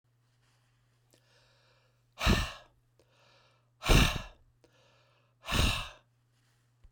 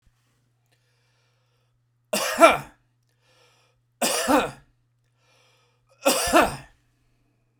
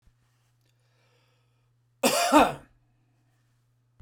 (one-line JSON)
{"exhalation_length": "6.9 s", "exhalation_amplitude": 9717, "exhalation_signal_mean_std_ratio": 0.29, "three_cough_length": "7.6 s", "three_cough_amplitude": 32767, "three_cough_signal_mean_std_ratio": 0.3, "cough_length": "4.0 s", "cough_amplitude": 17430, "cough_signal_mean_std_ratio": 0.27, "survey_phase": "beta (2021-08-13 to 2022-03-07)", "age": "45-64", "gender": "Male", "wearing_mask": "No", "symptom_none": true, "smoker_status": "Never smoked", "respiratory_condition_asthma": false, "respiratory_condition_other": false, "recruitment_source": "REACT", "submission_delay": "2 days", "covid_test_result": "Negative", "covid_test_method": "RT-qPCR"}